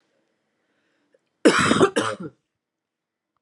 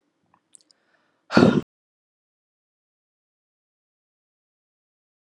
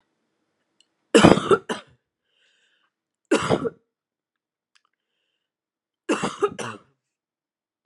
{"cough_length": "3.4 s", "cough_amplitude": 26177, "cough_signal_mean_std_ratio": 0.32, "exhalation_length": "5.2 s", "exhalation_amplitude": 31537, "exhalation_signal_mean_std_ratio": 0.16, "three_cough_length": "7.9 s", "three_cough_amplitude": 32768, "three_cough_signal_mean_std_ratio": 0.25, "survey_phase": "beta (2021-08-13 to 2022-03-07)", "age": "18-44", "gender": "Female", "wearing_mask": "No", "symptom_new_continuous_cough": true, "symptom_runny_or_blocked_nose": true, "symptom_shortness_of_breath": true, "symptom_sore_throat": true, "symptom_onset": "3 days", "smoker_status": "Never smoked", "respiratory_condition_asthma": false, "respiratory_condition_other": false, "recruitment_source": "Test and Trace", "submission_delay": "1 day", "covid_test_result": "Positive", "covid_test_method": "RT-qPCR", "covid_ct_value": 25.5, "covid_ct_gene": "N gene"}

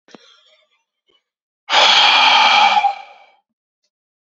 {"exhalation_length": "4.4 s", "exhalation_amplitude": 29202, "exhalation_signal_mean_std_ratio": 0.47, "survey_phase": "beta (2021-08-13 to 2022-03-07)", "age": "18-44", "gender": "Male", "wearing_mask": "No", "symptom_cough_any": true, "symptom_new_continuous_cough": true, "symptom_headache": true, "smoker_status": "Never smoked", "respiratory_condition_asthma": false, "respiratory_condition_other": false, "recruitment_source": "Test and Trace", "submission_delay": "2 days", "covid_test_result": "Negative", "covid_test_method": "RT-qPCR"}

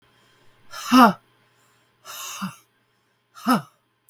{"exhalation_length": "4.1 s", "exhalation_amplitude": 32768, "exhalation_signal_mean_std_ratio": 0.27, "survey_phase": "beta (2021-08-13 to 2022-03-07)", "age": "45-64", "gender": "Female", "wearing_mask": "No", "symptom_cough_any": true, "symptom_new_continuous_cough": true, "symptom_runny_or_blocked_nose": true, "symptom_shortness_of_breath": true, "symptom_sore_throat": true, "symptom_diarrhoea": true, "symptom_fever_high_temperature": true, "symptom_headache": true, "symptom_onset": "5 days", "smoker_status": "Never smoked", "respiratory_condition_asthma": true, "respiratory_condition_other": false, "recruitment_source": "Test and Trace", "submission_delay": "3 days", "covid_test_result": "Positive", "covid_test_method": "RT-qPCR", "covid_ct_value": 27.2, "covid_ct_gene": "N gene"}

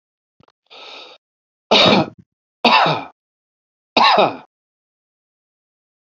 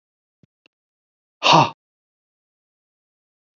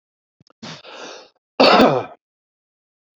{"three_cough_length": "6.1 s", "three_cough_amplitude": 32767, "three_cough_signal_mean_std_ratio": 0.34, "exhalation_length": "3.6 s", "exhalation_amplitude": 28535, "exhalation_signal_mean_std_ratio": 0.2, "cough_length": "3.2 s", "cough_amplitude": 29359, "cough_signal_mean_std_ratio": 0.32, "survey_phase": "beta (2021-08-13 to 2022-03-07)", "age": "45-64", "gender": "Male", "wearing_mask": "No", "symptom_none": true, "smoker_status": "Ex-smoker", "respiratory_condition_asthma": false, "respiratory_condition_other": false, "recruitment_source": "REACT", "submission_delay": "1 day", "covid_test_result": "Negative", "covid_test_method": "RT-qPCR", "influenza_a_test_result": "Unknown/Void", "influenza_b_test_result": "Unknown/Void"}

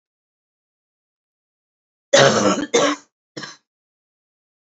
{"cough_length": "4.7 s", "cough_amplitude": 32767, "cough_signal_mean_std_ratio": 0.31, "survey_phase": "beta (2021-08-13 to 2022-03-07)", "age": "18-44", "gender": "Female", "wearing_mask": "No", "symptom_cough_any": true, "symptom_runny_or_blocked_nose": true, "symptom_shortness_of_breath": true, "symptom_sore_throat": true, "symptom_onset": "4 days", "smoker_status": "Current smoker (1 to 10 cigarettes per day)", "respiratory_condition_asthma": false, "respiratory_condition_other": false, "recruitment_source": "Test and Trace", "submission_delay": "1 day", "covid_test_result": "Negative", "covid_test_method": "RT-qPCR"}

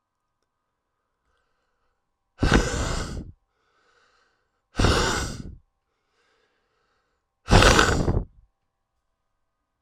{"exhalation_length": "9.8 s", "exhalation_amplitude": 32767, "exhalation_signal_mean_std_ratio": 0.33, "survey_phase": "alpha (2021-03-01 to 2021-08-12)", "age": "18-44", "gender": "Male", "wearing_mask": "No", "symptom_cough_any": true, "symptom_shortness_of_breath": true, "symptom_fatigue": true, "symptom_headache": true, "symptom_loss_of_taste": true, "symptom_onset": "6 days", "smoker_status": "Ex-smoker", "respiratory_condition_asthma": false, "respiratory_condition_other": true, "recruitment_source": "REACT", "submission_delay": "1 day", "covid_test_result": "Positive", "covid_test_method": "RT-qPCR", "covid_ct_value": 21.0, "covid_ct_gene": "N gene"}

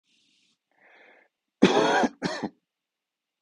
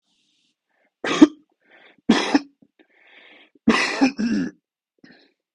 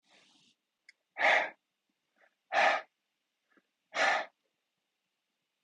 {"cough_length": "3.4 s", "cough_amplitude": 22491, "cough_signal_mean_std_ratio": 0.33, "three_cough_length": "5.5 s", "three_cough_amplitude": 32768, "three_cough_signal_mean_std_ratio": 0.32, "exhalation_length": "5.6 s", "exhalation_amplitude": 6830, "exhalation_signal_mean_std_ratio": 0.31, "survey_phase": "beta (2021-08-13 to 2022-03-07)", "age": "45-64", "gender": "Male", "wearing_mask": "No", "symptom_cough_any": true, "symptom_runny_or_blocked_nose": true, "symptom_sore_throat": true, "symptom_fatigue": true, "symptom_fever_high_temperature": true, "symptom_headache": true, "symptom_other": true, "smoker_status": "Never smoked", "respiratory_condition_asthma": false, "respiratory_condition_other": false, "recruitment_source": "Test and Trace", "submission_delay": "1 day", "covid_test_result": "Positive", "covid_test_method": "RT-qPCR", "covid_ct_value": 18.1, "covid_ct_gene": "ORF1ab gene", "covid_ct_mean": 18.3, "covid_viral_load": "960000 copies/ml", "covid_viral_load_category": "Low viral load (10K-1M copies/ml)"}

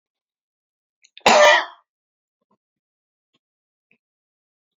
{"cough_length": "4.8 s", "cough_amplitude": 28061, "cough_signal_mean_std_ratio": 0.23, "survey_phase": "beta (2021-08-13 to 2022-03-07)", "age": "45-64", "gender": "Male", "wearing_mask": "No", "symptom_none": true, "smoker_status": "Ex-smoker", "respiratory_condition_asthma": false, "respiratory_condition_other": false, "recruitment_source": "REACT", "submission_delay": "2 days", "covid_test_result": "Negative", "covid_test_method": "RT-qPCR", "influenza_a_test_result": "Negative", "influenza_b_test_result": "Negative"}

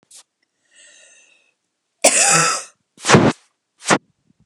{"cough_length": "4.5 s", "cough_amplitude": 32768, "cough_signal_mean_std_ratio": 0.36, "survey_phase": "beta (2021-08-13 to 2022-03-07)", "age": "45-64", "gender": "Female", "wearing_mask": "No", "symptom_none": true, "smoker_status": "Never smoked", "respiratory_condition_asthma": false, "respiratory_condition_other": false, "recruitment_source": "REACT", "submission_delay": "1 day", "covid_test_result": "Negative", "covid_test_method": "RT-qPCR", "influenza_a_test_result": "Unknown/Void", "influenza_b_test_result": "Unknown/Void"}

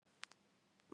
{"three_cough_length": "0.9 s", "three_cough_amplitude": 1662, "three_cough_signal_mean_std_ratio": 0.25, "survey_phase": "beta (2021-08-13 to 2022-03-07)", "age": "18-44", "gender": "Female", "wearing_mask": "No", "symptom_cough_any": true, "symptom_new_continuous_cough": true, "symptom_runny_or_blocked_nose": true, "symptom_sore_throat": true, "symptom_fatigue": true, "symptom_fever_high_temperature": true, "symptom_headache": true, "symptom_onset": "3 days", "smoker_status": "Never smoked", "respiratory_condition_asthma": false, "respiratory_condition_other": false, "recruitment_source": "Test and Trace", "submission_delay": "2 days", "covid_test_result": "Positive", "covid_test_method": "RT-qPCR"}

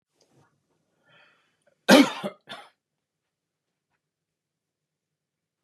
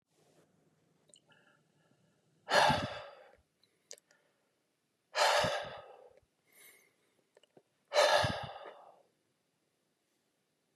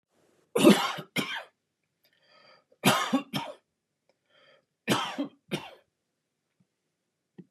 {"cough_length": "5.6 s", "cough_amplitude": 27870, "cough_signal_mean_std_ratio": 0.16, "exhalation_length": "10.8 s", "exhalation_amplitude": 7340, "exhalation_signal_mean_std_ratio": 0.3, "three_cough_length": "7.5 s", "three_cough_amplitude": 19302, "three_cough_signal_mean_std_ratio": 0.3, "survey_phase": "beta (2021-08-13 to 2022-03-07)", "age": "65+", "gender": "Male", "wearing_mask": "No", "symptom_none": true, "smoker_status": "Never smoked", "respiratory_condition_asthma": false, "respiratory_condition_other": false, "recruitment_source": "REACT", "submission_delay": "2 days", "covid_test_result": "Negative", "covid_test_method": "RT-qPCR", "influenza_a_test_result": "Negative", "influenza_b_test_result": "Negative"}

